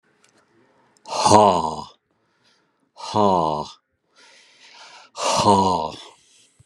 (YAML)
exhalation_length: 6.7 s
exhalation_amplitude: 32768
exhalation_signal_mean_std_ratio: 0.41
survey_phase: alpha (2021-03-01 to 2021-08-12)
age: 65+
gender: Male
wearing_mask: 'No'
symptom_none: true
smoker_status: Ex-smoker
respiratory_condition_asthma: false
respiratory_condition_other: false
recruitment_source: REACT
submission_delay: 2 days
covid_test_result: Negative
covid_test_method: RT-qPCR